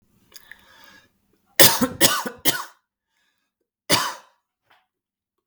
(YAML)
cough_length: 5.5 s
cough_amplitude: 32768
cough_signal_mean_std_ratio: 0.28
survey_phase: beta (2021-08-13 to 2022-03-07)
age: 45-64
gender: Male
wearing_mask: 'No'
symptom_none: true
smoker_status: Ex-smoker
respiratory_condition_asthma: false
respiratory_condition_other: false
recruitment_source: Test and Trace
submission_delay: 2 days
covid_test_result: Positive
covid_test_method: ePCR